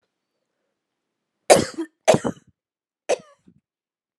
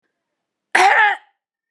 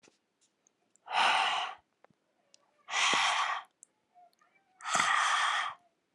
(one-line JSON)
{"three_cough_length": "4.2 s", "three_cough_amplitude": 32767, "three_cough_signal_mean_std_ratio": 0.22, "cough_length": "1.7 s", "cough_amplitude": 31548, "cough_signal_mean_std_ratio": 0.41, "exhalation_length": "6.1 s", "exhalation_amplitude": 7241, "exhalation_signal_mean_std_ratio": 0.51, "survey_phase": "alpha (2021-03-01 to 2021-08-12)", "age": "18-44", "gender": "Female", "wearing_mask": "No", "symptom_fever_high_temperature": true, "symptom_headache": true, "symptom_change_to_sense_of_smell_or_taste": true, "symptom_loss_of_taste": true, "smoker_status": "Never smoked", "respiratory_condition_asthma": false, "respiratory_condition_other": false, "recruitment_source": "Test and Trace", "submission_delay": "2 days", "covid_test_result": "Positive", "covid_test_method": "RT-qPCR", "covid_ct_value": 19.7, "covid_ct_gene": "ORF1ab gene", "covid_ct_mean": 21.0, "covid_viral_load": "130000 copies/ml", "covid_viral_load_category": "Low viral load (10K-1M copies/ml)"}